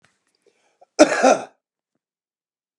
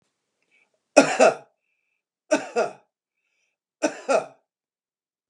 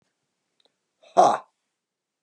{"cough_length": "2.8 s", "cough_amplitude": 32768, "cough_signal_mean_std_ratio": 0.26, "three_cough_length": "5.3 s", "three_cough_amplitude": 32767, "three_cough_signal_mean_std_ratio": 0.28, "exhalation_length": "2.2 s", "exhalation_amplitude": 21092, "exhalation_signal_mean_std_ratio": 0.23, "survey_phase": "beta (2021-08-13 to 2022-03-07)", "age": "45-64", "gender": "Male", "wearing_mask": "No", "symptom_none": true, "smoker_status": "Never smoked", "respiratory_condition_asthma": false, "respiratory_condition_other": false, "recruitment_source": "REACT", "submission_delay": "3 days", "covid_test_result": "Negative", "covid_test_method": "RT-qPCR", "influenza_a_test_result": "Negative", "influenza_b_test_result": "Negative"}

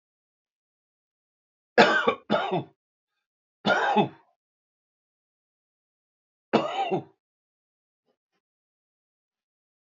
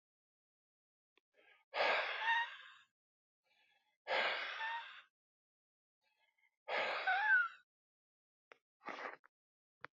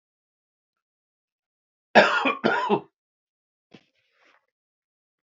{"three_cough_length": "10.0 s", "three_cough_amplitude": 23314, "three_cough_signal_mean_std_ratio": 0.28, "exhalation_length": "10.0 s", "exhalation_amplitude": 2310, "exhalation_signal_mean_std_ratio": 0.4, "cough_length": "5.3 s", "cough_amplitude": 27062, "cough_signal_mean_std_ratio": 0.26, "survey_phase": "beta (2021-08-13 to 2022-03-07)", "age": "45-64", "gender": "Male", "wearing_mask": "No", "symptom_none": true, "smoker_status": "Ex-smoker", "respiratory_condition_asthma": false, "respiratory_condition_other": false, "recruitment_source": "REACT", "submission_delay": "0 days", "covid_test_result": "Negative", "covid_test_method": "RT-qPCR", "influenza_a_test_result": "Negative", "influenza_b_test_result": "Negative"}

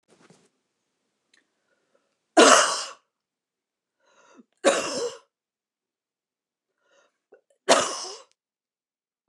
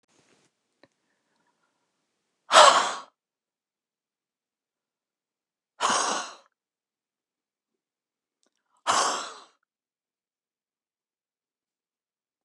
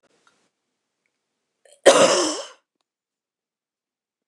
{"three_cough_length": "9.3 s", "three_cough_amplitude": 28600, "three_cough_signal_mean_std_ratio": 0.24, "exhalation_length": "12.4 s", "exhalation_amplitude": 28799, "exhalation_signal_mean_std_ratio": 0.21, "cough_length": "4.3 s", "cough_amplitude": 29204, "cough_signal_mean_std_ratio": 0.25, "survey_phase": "beta (2021-08-13 to 2022-03-07)", "age": "65+", "gender": "Female", "wearing_mask": "No", "symptom_change_to_sense_of_smell_or_taste": true, "smoker_status": "Never smoked", "respiratory_condition_asthma": false, "respiratory_condition_other": false, "recruitment_source": "REACT", "submission_delay": "2 days", "covid_test_result": "Negative", "covid_test_method": "RT-qPCR"}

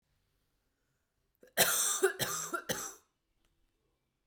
{"cough_length": "4.3 s", "cough_amplitude": 10015, "cough_signal_mean_std_ratio": 0.38, "survey_phase": "beta (2021-08-13 to 2022-03-07)", "age": "18-44", "gender": "Female", "wearing_mask": "No", "symptom_runny_or_blocked_nose": true, "symptom_headache": true, "smoker_status": "Never smoked", "respiratory_condition_asthma": true, "respiratory_condition_other": false, "recruitment_source": "Test and Trace", "submission_delay": "2 days", "covid_test_result": "Positive", "covid_test_method": "RT-qPCR"}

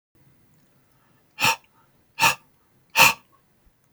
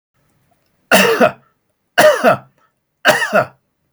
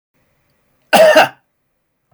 {"exhalation_length": "3.9 s", "exhalation_amplitude": 28566, "exhalation_signal_mean_std_ratio": 0.27, "three_cough_length": "3.9 s", "three_cough_amplitude": 32767, "three_cough_signal_mean_std_ratio": 0.44, "cough_length": "2.1 s", "cough_amplitude": 31591, "cough_signal_mean_std_ratio": 0.35, "survey_phase": "beta (2021-08-13 to 2022-03-07)", "age": "45-64", "gender": "Male", "wearing_mask": "No", "symptom_none": true, "smoker_status": "Never smoked", "respiratory_condition_asthma": false, "respiratory_condition_other": false, "recruitment_source": "REACT", "submission_delay": "3 days", "covid_test_result": "Negative", "covid_test_method": "RT-qPCR"}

